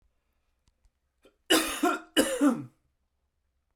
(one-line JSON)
{"cough_length": "3.8 s", "cough_amplitude": 12573, "cough_signal_mean_std_ratio": 0.37, "survey_phase": "beta (2021-08-13 to 2022-03-07)", "age": "18-44", "gender": "Male", "wearing_mask": "No", "symptom_none": true, "smoker_status": "Never smoked", "respiratory_condition_asthma": false, "respiratory_condition_other": false, "recruitment_source": "REACT", "submission_delay": "3 days", "covid_test_result": "Negative", "covid_test_method": "RT-qPCR", "influenza_a_test_result": "Negative", "influenza_b_test_result": "Negative"}